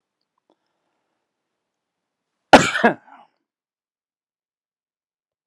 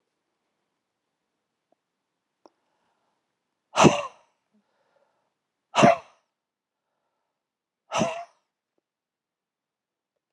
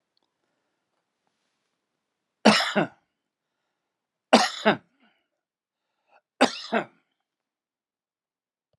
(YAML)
cough_length: 5.5 s
cough_amplitude: 32768
cough_signal_mean_std_ratio: 0.15
exhalation_length: 10.3 s
exhalation_amplitude: 27522
exhalation_signal_mean_std_ratio: 0.18
three_cough_length: 8.8 s
three_cough_amplitude: 30667
three_cough_signal_mean_std_ratio: 0.22
survey_phase: beta (2021-08-13 to 2022-03-07)
age: 65+
gender: Male
wearing_mask: 'No'
symptom_none: true
smoker_status: Ex-smoker
respiratory_condition_asthma: false
respiratory_condition_other: false
recruitment_source: REACT
submission_delay: 2 days
covid_test_result: Negative
covid_test_method: RT-qPCR